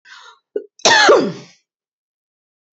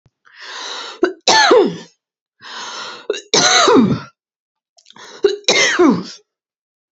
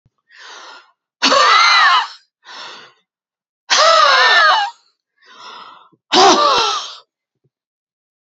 {"cough_length": "2.7 s", "cough_amplitude": 32583, "cough_signal_mean_std_ratio": 0.36, "three_cough_length": "6.9 s", "three_cough_amplitude": 32768, "three_cough_signal_mean_std_ratio": 0.49, "exhalation_length": "8.3 s", "exhalation_amplitude": 32615, "exhalation_signal_mean_std_ratio": 0.5, "survey_phase": "beta (2021-08-13 to 2022-03-07)", "age": "45-64", "gender": "Female", "wearing_mask": "No", "symptom_none": true, "smoker_status": "Never smoked", "respiratory_condition_asthma": true, "respiratory_condition_other": false, "recruitment_source": "REACT", "submission_delay": "3 days", "covid_test_result": "Negative", "covid_test_method": "RT-qPCR", "influenza_a_test_result": "Negative", "influenza_b_test_result": "Negative"}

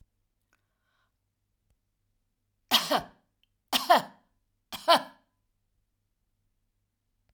{"three_cough_length": "7.3 s", "three_cough_amplitude": 16449, "three_cough_signal_mean_std_ratio": 0.22, "survey_phase": "alpha (2021-03-01 to 2021-08-12)", "age": "65+", "gender": "Female", "wearing_mask": "No", "symptom_none": true, "smoker_status": "Never smoked", "respiratory_condition_asthma": false, "respiratory_condition_other": false, "recruitment_source": "REACT", "submission_delay": "2 days", "covid_test_result": "Negative", "covid_test_method": "RT-qPCR"}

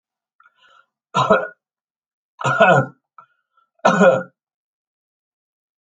{"three_cough_length": "5.8 s", "three_cough_amplitude": 30421, "three_cough_signal_mean_std_ratio": 0.33, "survey_phase": "alpha (2021-03-01 to 2021-08-12)", "age": "65+", "gender": "Male", "wearing_mask": "No", "symptom_none": true, "smoker_status": "Ex-smoker", "respiratory_condition_asthma": false, "respiratory_condition_other": false, "recruitment_source": "REACT", "submission_delay": "1 day", "covid_test_result": "Negative", "covid_test_method": "RT-qPCR"}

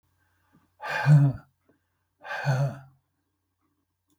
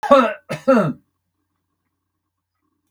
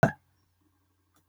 {"exhalation_length": "4.2 s", "exhalation_amplitude": 11052, "exhalation_signal_mean_std_ratio": 0.35, "three_cough_length": "2.9 s", "three_cough_amplitude": 32768, "three_cough_signal_mean_std_ratio": 0.34, "cough_length": "1.3 s", "cough_amplitude": 16263, "cough_signal_mean_std_ratio": 0.17, "survey_phase": "beta (2021-08-13 to 2022-03-07)", "age": "65+", "gender": "Male", "wearing_mask": "No", "symptom_none": true, "smoker_status": "Never smoked", "respiratory_condition_asthma": false, "respiratory_condition_other": false, "recruitment_source": "REACT", "submission_delay": "9 days", "covid_test_result": "Negative", "covid_test_method": "RT-qPCR", "influenza_a_test_result": "Negative", "influenza_b_test_result": "Negative"}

